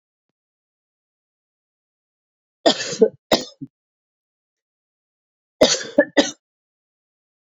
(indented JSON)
{
  "cough_length": "7.5 s",
  "cough_amplitude": 32768,
  "cough_signal_mean_std_ratio": 0.22,
  "survey_phase": "beta (2021-08-13 to 2022-03-07)",
  "age": "45-64",
  "gender": "Female",
  "wearing_mask": "No",
  "symptom_cough_any": true,
  "symptom_sore_throat": true,
  "symptom_fatigue": true,
  "symptom_fever_high_temperature": true,
  "symptom_headache": true,
  "symptom_onset": "3 days",
  "smoker_status": "Never smoked",
  "respiratory_condition_asthma": false,
  "respiratory_condition_other": false,
  "recruitment_source": "Test and Trace",
  "submission_delay": "2 days",
  "covid_test_result": "Positive",
  "covid_test_method": "RT-qPCR",
  "covid_ct_value": 31.0,
  "covid_ct_gene": "N gene"
}